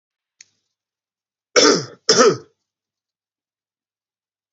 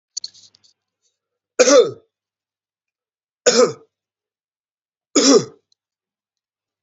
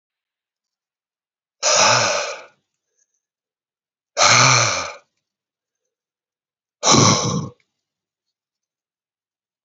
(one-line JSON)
{"cough_length": "4.5 s", "cough_amplitude": 31323, "cough_signal_mean_std_ratio": 0.27, "three_cough_length": "6.8 s", "three_cough_amplitude": 30089, "three_cough_signal_mean_std_ratio": 0.28, "exhalation_length": "9.6 s", "exhalation_amplitude": 32768, "exhalation_signal_mean_std_ratio": 0.35, "survey_phase": "beta (2021-08-13 to 2022-03-07)", "age": "18-44", "gender": "Male", "wearing_mask": "No", "symptom_runny_or_blocked_nose": true, "symptom_headache": true, "symptom_other": true, "symptom_onset": "6 days", "smoker_status": "Never smoked", "respiratory_condition_asthma": false, "respiratory_condition_other": false, "recruitment_source": "Test and Trace", "submission_delay": "2 days", "covid_test_result": "Positive", "covid_test_method": "RT-qPCR", "covid_ct_value": 19.8, "covid_ct_gene": "ORF1ab gene", "covid_ct_mean": 20.2, "covid_viral_load": "240000 copies/ml", "covid_viral_load_category": "Low viral load (10K-1M copies/ml)"}